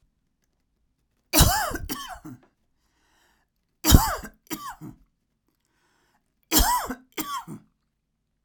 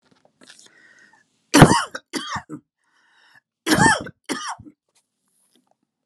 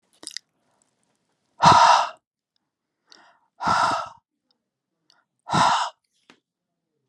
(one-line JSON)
{"three_cough_length": "8.4 s", "three_cough_amplitude": 32767, "three_cough_signal_mean_std_ratio": 0.3, "cough_length": "6.1 s", "cough_amplitude": 32768, "cough_signal_mean_std_ratio": 0.27, "exhalation_length": "7.1 s", "exhalation_amplitude": 32020, "exhalation_signal_mean_std_ratio": 0.32, "survey_phase": "alpha (2021-03-01 to 2021-08-12)", "age": "45-64", "gender": "Female", "wearing_mask": "No", "symptom_none": true, "smoker_status": "Never smoked", "respiratory_condition_asthma": false, "respiratory_condition_other": false, "recruitment_source": "REACT", "submission_delay": "1 day", "covid_test_result": "Negative", "covid_test_method": "RT-qPCR"}